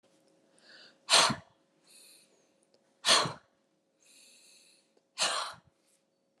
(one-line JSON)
{"exhalation_length": "6.4 s", "exhalation_amplitude": 11840, "exhalation_signal_mean_std_ratio": 0.27, "survey_phase": "alpha (2021-03-01 to 2021-08-12)", "age": "45-64", "gender": "Female", "wearing_mask": "No", "symptom_none": true, "smoker_status": "Never smoked", "respiratory_condition_asthma": false, "respiratory_condition_other": false, "recruitment_source": "REACT", "submission_delay": "1 day", "covid_test_result": "Negative", "covid_test_method": "RT-qPCR"}